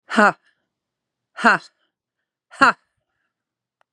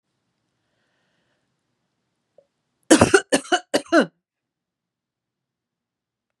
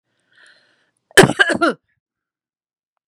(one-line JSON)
{"exhalation_length": "3.9 s", "exhalation_amplitude": 32767, "exhalation_signal_mean_std_ratio": 0.25, "three_cough_length": "6.4 s", "three_cough_amplitude": 32730, "three_cough_signal_mean_std_ratio": 0.22, "cough_length": "3.1 s", "cough_amplitude": 32768, "cough_signal_mean_std_ratio": 0.26, "survey_phase": "beta (2021-08-13 to 2022-03-07)", "age": "65+", "gender": "Female", "wearing_mask": "No", "symptom_none": true, "smoker_status": "Current smoker (1 to 10 cigarettes per day)", "respiratory_condition_asthma": false, "respiratory_condition_other": false, "recruitment_source": "REACT", "submission_delay": "1 day", "covid_test_result": "Negative", "covid_test_method": "RT-qPCR", "influenza_a_test_result": "Negative", "influenza_b_test_result": "Negative"}